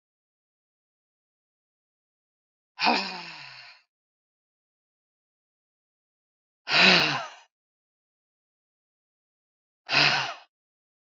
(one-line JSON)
{"exhalation_length": "11.2 s", "exhalation_amplitude": 24972, "exhalation_signal_mean_std_ratio": 0.25, "survey_phase": "beta (2021-08-13 to 2022-03-07)", "age": "45-64", "gender": "Female", "wearing_mask": "No", "symptom_none": true, "smoker_status": "Ex-smoker", "respiratory_condition_asthma": false, "respiratory_condition_other": false, "recruitment_source": "REACT", "submission_delay": "1 day", "covid_test_result": "Negative", "covid_test_method": "RT-qPCR", "influenza_a_test_result": "Negative", "influenza_b_test_result": "Negative"}